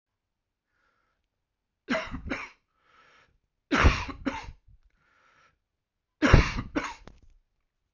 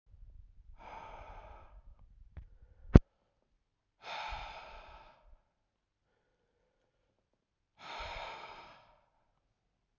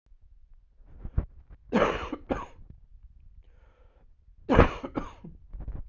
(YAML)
three_cough_length: 7.9 s
three_cough_amplitude: 22622
three_cough_signal_mean_std_ratio: 0.28
exhalation_length: 10.0 s
exhalation_amplitude: 28401
exhalation_signal_mean_std_ratio: 0.15
cough_length: 5.9 s
cough_amplitude: 29396
cough_signal_mean_std_ratio: 0.34
survey_phase: beta (2021-08-13 to 2022-03-07)
age: 45-64
gender: Male
wearing_mask: 'No'
symptom_runny_or_blocked_nose: true
symptom_change_to_sense_of_smell_or_taste: true
symptom_onset: 4 days
smoker_status: Ex-smoker
respiratory_condition_asthma: true
respiratory_condition_other: false
recruitment_source: Test and Trace
submission_delay: 1 day
covid_test_result: Positive
covid_test_method: RT-qPCR